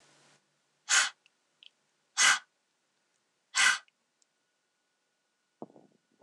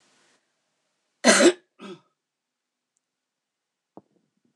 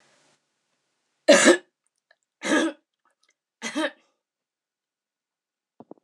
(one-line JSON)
{"exhalation_length": "6.2 s", "exhalation_amplitude": 11241, "exhalation_signal_mean_std_ratio": 0.25, "cough_length": "4.6 s", "cough_amplitude": 25551, "cough_signal_mean_std_ratio": 0.2, "three_cough_length": "6.0 s", "three_cough_amplitude": 24564, "three_cough_signal_mean_std_ratio": 0.25, "survey_phase": "alpha (2021-03-01 to 2021-08-12)", "age": "45-64", "gender": "Female", "wearing_mask": "No", "symptom_none": true, "smoker_status": "Ex-smoker", "respiratory_condition_asthma": false, "respiratory_condition_other": false, "recruitment_source": "REACT", "submission_delay": "2 days", "covid_test_result": "Negative", "covid_test_method": "RT-qPCR"}